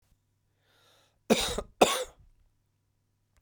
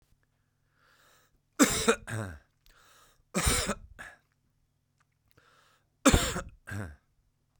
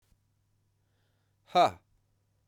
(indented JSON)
{
  "cough_length": "3.4 s",
  "cough_amplitude": 16145,
  "cough_signal_mean_std_ratio": 0.26,
  "three_cough_length": "7.6 s",
  "three_cough_amplitude": 14810,
  "three_cough_signal_mean_std_ratio": 0.31,
  "exhalation_length": "2.5 s",
  "exhalation_amplitude": 8289,
  "exhalation_signal_mean_std_ratio": 0.21,
  "survey_phase": "beta (2021-08-13 to 2022-03-07)",
  "age": "45-64",
  "gender": "Male",
  "wearing_mask": "No",
  "symptom_cough_any": true,
  "symptom_runny_or_blocked_nose": true,
  "symptom_sore_throat": true,
  "symptom_fatigue": true,
  "symptom_fever_high_temperature": true,
  "symptom_headache": true,
  "symptom_onset": "4 days",
  "smoker_status": "Never smoked",
  "respiratory_condition_asthma": false,
  "respiratory_condition_other": false,
  "recruitment_source": "Test and Trace",
  "submission_delay": "2 days",
  "covid_test_result": "Positive",
  "covid_test_method": "LAMP"
}